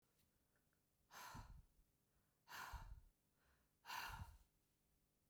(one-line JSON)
{"exhalation_length": "5.3 s", "exhalation_amplitude": 446, "exhalation_signal_mean_std_ratio": 0.48, "survey_phase": "beta (2021-08-13 to 2022-03-07)", "age": "45-64", "gender": "Female", "wearing_mask": "No", "symptom_cough_any": true, "symptom_runny_or_blocked_nose": true, "symptom_fatigue": true, "symptom_change_to_sense_of_smell_or_taste": true, "symptom_onset": "8 days", "smoker_status": "Never smoked", "respiratory_condition_asthma": true, "respiratory_condition_other": false, "recruitment_source": "Test and Trace", "submission_delay": "1 day", "covid_test_result": "Positive", "covid_test_method": "RT-qPCR", "covid_ct_value": 25.3, "covid_ct_gene": "N gene"}